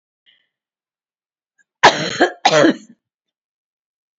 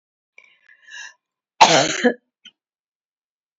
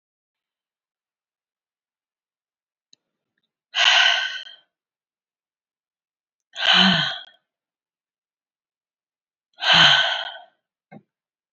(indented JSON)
{
  "cough_length": "4.2 s",
  "cough_amplitude": 29139,
  "cough_signal_mean_std_ratio": 0.3,
  "three_cough_length": "3.6 s",
  "three_cough_amplitude": 28509,
  "three_cough_signal_mean_std_ratio": 0.27,
  "exhalation_length": "11.5 s",
  "exhalation_amplitude": 25869,
  "exhalation_signal_mean_std_ratio": 0.3,
  "survey_phase": "beta (2021-08-13 to 2022-03-07)",
  "age": "45-64",
  "gender": "Female",
  "wearing_mask": "No",
  "symptom_none": true,
  "symptom_onset": "3 days",
  "smoker_status": "Never smoked",
  "respiratory_condition_asthma": false,
  "respiratory_condition_other": false,
  "recruitment_source": "REACT",
  "submission_delay": "2 days",
  "covid_test_result": "Negative",
  "covid_test_method": "RT-qPCR",
  "influenza_a_test_result": "Negative",
  "influenza_b_test_result": "Negative"
}